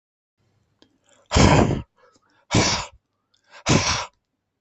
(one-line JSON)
{"exhalation_length": "4.6 s", "exhalation_amplitude": 32768, "exhalation_signal_mean_std_ratio": 0.39, "survey_phase": "beta (2021-08-13 to 2022-03-07)", "age": "45-64", "gender": "Male", "wearing_mask": "No", "symptom_none": true, "smoker_status": "Never smoked", "respiratory_condition_asthma": false, "respiratory_condition_other": false, "recruitment_source": "REACT", "submission_delay": "2 days", "covid_test_result": "Negative", "covid_test_method": "RT-qPCR", "influenza_a_test_result": "Negative", "influenza_b_test_result": "Negative"}